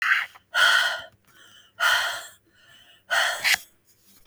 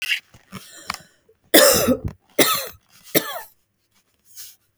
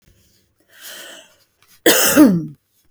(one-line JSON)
{"exhalation_length": "4.3 s", "exhalation_amplitude": 17413, "exhalation_signal_mean_std_ratio": 0.51, "three_cough_length": "4.8 s", "three_cough_amplitude": 32768, "three_cough_signal_mean_std_ratio": 0.36, "cough_length": "2.9 s", "cough_amplitude": 32768, "cough_signal_mean_std_ratio": 0.38, "survey_phase": "beta (2021-08-13 to 2022-03-07)", "age": "45-64", "gender": "Female", "wearing_mask": "No", "symptom_none": true, "symptom_onset": "1 day", "smoker_status": "Never smoked", "respiratory_condition_asthma": false, "respiratory_condition_other": false, "recruitment_source": "Test and Trace", "submission_delay": "1 day", "covid_test_result": "Negative", "covid_test_method": "RT-qPCR"}